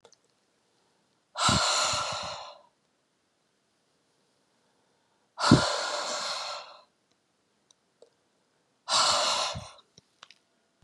{"exhalation_length": "10.8 s", "exhalation_amplitude": 20566, "exhalation_signal_mean_std_ratio": 0.38, "survey_phase": "beta (2021-08-13 to 2022-03-07)", "age": "45-64", "gender": "Female", "wearing_mask": "No", "symptom_cough_any": true, "smoker_status": "Never smoked", "respiratory_condition_asthma": false, "respiratory_condition_other": false, "recruitment_source": "REACT", "submission_delay": "1 day", "covid_test_result": "Negative", "covid_test_method": "RT-qPCR", "influenza_a_test_result": "Negative", "influenza_b_test_result": "Negative"}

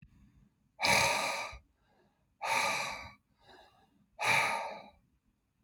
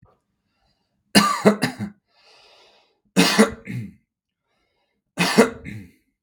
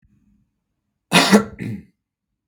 {"exhalation_length": "5.6 s", "exhalation_amplitude": 7272, "exhalation_signal_mean_std_ratio": 0.47, "three_cough_length": "6.2 s", "three_cough_amplitude": 32768, "three_cough_signal_mean_std_ratio": 0.34, "cough_length": "2.5 s", "cough_amplitude": 32768, "cough_signal_mean_std_ratio": 0.3, "survey_phase": "beta (2021-08-13 to 2022-03-07)", "age": "18-44", "gender": "Male", "wearing_mask": "No", "symptom_none": true, "smoker_status": "Never smoked", "respiratory_condition_asthma": false, "respiratory_condition_other": false, "recruitment_source": "REACT", "submission_delay": "2 days", "covid_test_result": "Negative", "covid_test_method": "RT-qPCR"}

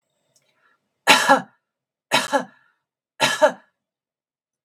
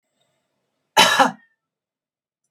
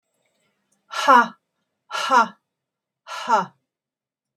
{"three_cough_length": "4.6 s", "three_cough_amplitude": 32768, "three_cough_signal_mean_std_ratio": 0.31, "cough_length": "2.5 s", "cough_amplitude": 32768, "cough_signal_mean_std_ratio": 0.28, "exhalation_length": "4.4 s", "exhalation_amplitude": 26695, "exhalation_signal_mean_std_ratio": 0.32, "survey_phase": "beta (2021-08-13 to 2022-03-07)", "age": "65+", "gender": "Female", "wearing_mask": "No", "symptom_none": true, "smoker_status": "Never smoked", "respiratory_condition_asthma": false, "respiratory_condition_other": false, "recruitment_source": "REACT", "submission_delay": "1 day", "covid_test_result": "Negative", "covid_test_method": "RT-qPCR", "influenza_a_test_result": "Unknown/Void", "influenza_b_test_result": "Unknown/Void"}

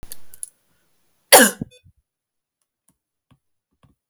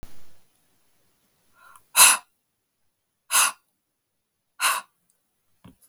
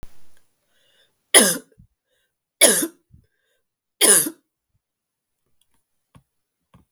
{"cough_length": "4.1 s", "cough_amplitude": 32768, "cough_signal_mean_std_ratio": 0.2, "exhalation_length": "5.9 s", "exhalation_amplitude": 32768, "exhalation_signal_mean_std_ratio": 0.26, "three_cough_length": "6.9 s", "three_cough_amplitude": 32768, "three_cough_signal_mean_std_ratio": 0.25, "survey_phase": "beta (2021-08-13 to 2022-03-07)", "age": "45-64", "gender": "Female", "wearing_mask": "No", "symptom_cough_any": true, "symptom_runny_or_blocked_nose": true, "symptom_fatigue": true, "smoker_status": "Never smoked", "respiratory_condition_asthma": false, "respiratory_condition_other": false, "recruitment_source": "Test and Trace", "submission_delay": "2 days", "covid_test_result": "Positive", "covid_test_method": "LFT"}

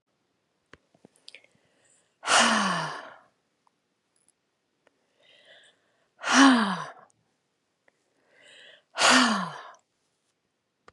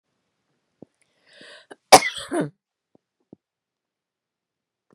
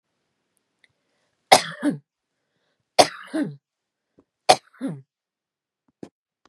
{"exhalation_length": "10.9 s", "exhalation_amplitude": 20144, "exhalation_signal_mean_std_ratio": 0.31, "cough_length": "4.9 s", "cough_amplitude": 32768, "cough_signal_mean_std_ratio": 0.15, "three_cough_length": "6.5 s", "three_cough_amplitude": 32768, "three_cough_signal_mean_std_ratio": 0.21, "survey_phase": "beta (2021-08-13 to 2022-03-07)", "age": "65+", "gender": "Female", "wearing_mask": "No", "symptom_headache": true, "symptom_onset": "13 days", "smoker_status": "Ex-smoker", "respiratory_condition_asthma": false, "respiratory_condition_other": false, "recruitment_source": "REACT", "submission_delay": "1 day", "covid_test_result": "Negative", "covid_test_method": "RT-qPCR", "influenza_a_test_result": "Negative", "influenza_b_test_result": "Negative"}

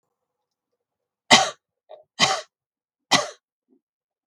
{"three_cough_length": "4.3 s", "three_cough_amplitude": 32768, "three_cough_signal_mean_std_ratio": 0.24, "survey_phase": "beta (2021-08-13 to 2022-03-07)", "age": "45-64", "gender": "Female", "wearing_mask": "No", "symptom_none": true, "smoker_status": "Never smoked", "respiratory_condition_asthma": false, "respiratory_condition_other": false, "recruitment_source": "Test and Trace", "submission_delay": "2 days", "covid_test_result": "Negative", "covid_test_method": "RT-qPCR"}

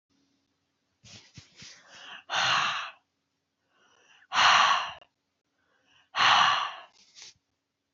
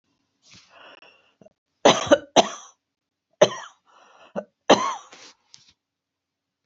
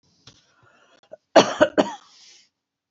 {"exhalation_length": "7.9 s", "exhalation_amplitude": 13396, "exhalation_signal_mean_std_ratio": 0.37, "three_cough_length": "6.7 s", "three_cough_amplitude": 29351, "three_cough_signal_mean_std_ratio": 0.24, "cough_length": "2.9 s", "cough_amplitude": 32463, "cough_signal_mean_std_ratio": 0.24, "survey_phase": "alpha (2021-03-01 to 2021-08-12)", "age": "65+", "gender": "Female", "wearing_mask": "No", "symptom_none": true, "smoker_status": "Ex-smoker", "respiratory_condition_asthma": false, "respiratory_condition_other": false, "recruitment_source": "REACT", "submission_delay": "1 day", "covid_test_result": "Negative", "covid_test_method": "RT-qPCR"}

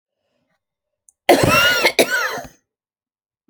{"cough_length": "3.5 s", "cough_amplitude": 32768, "cough_signal_mean_std_ratio": 0.42, "survey_phase": "alpha (2021-03-01 to 2021-08-12)", "age": "65+", "gender": "Female", "wearing_mask": "No", "symptom_fatigue": true, "symptom_onset": "12 days", "smoker_status": "Never smoked", "respiratory_condition_asthma": false, "respiratory_condition_other": false, "recruitment_source": "REACT", "submission_delay": "2 days", "covid_test_result": "Negative", "covid_test_method": "RT-qPCR"}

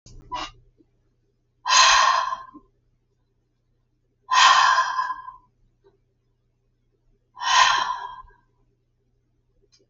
{"exhalation_length": "9.9 s", "exhalation_amplitude": 26457, "exhalation_signal_mean_std_ratio": 0.38, "survey_phase": "alpha (2021-03-01 to 2021-08-12)", "age": "65+", "gender": "Female", "wearing_mask": "No", "symptom_none": true, "smoker_status": "Ex-smoker", "respiratory_condition_asthma": false, "respiratory_condition_other": false, "recruitment_source": "REACT", "submission_delay": "3 days", "covid_test_result": "Negative", "covid_test_method": "RT-qPCR"}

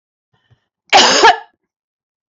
{"cough_length": "2.4 s", "cough_amplitude": 31393, "cough_signal_mean_std_ratio": 0.36, "survey_phase": "beta (2021-08-13 to 2022-03-07)", "age": "45-64", "gender": "Female", "wearing_mask": "No", "symptom_runny_or_blocked_nose": true, "symptom_shortness_of_breath": true, "symptom_abdominal_pain": true, "symptom_onset": "2 days", "smoker_status": "Never smoked", "respiratory_condition_asthma": false, "respiratory_condition_other": false, "recruitment_source": "Test and Trace", "submission_delay": "1 day", "covid_test_result": "Positive", "covid_test_method": "RT-qPCR", "covid_ct_value": 18.6, "covid_ct_gene": "ORF1ab gene", "covid_ct_mean": 18.8, "covid_viral_load": "670000 copies/ml", "covid_viral_load_category": "Low viral load (10K-1M copies/ml)"}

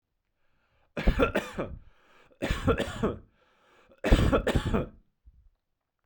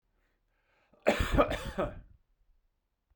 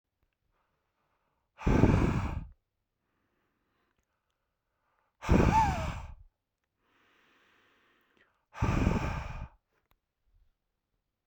{"three_cough_length": "6.1 s", "three_cough_amplitude": 16603, "three_cough_signal_mean_std_ratio": 0.42, "cough_length": "3.2 s", "cough_amplitude": 9431, "cough_signal_mean_std_ratio": 0.35, "exhalation_length": "11.3 s", "exhalation_amplitude": 13807, "exhalation_signal_mean_std_ratio": 0.34, "survey_phase": "beta (2021-08-13 to 2022-03-07)", "age": "45-64", "gender": "Male", "wearing_mask": "No", "symptom_none": true, "smoker_status": "Ex-smoker", "respiratory_condition_asthma": false, "respiratory_condition_other": false, "recruitment_source": "REACT", "submission_delay": "1 day", "covid_test_result": "Negative", "covid_test_method": "RT-qPCR"}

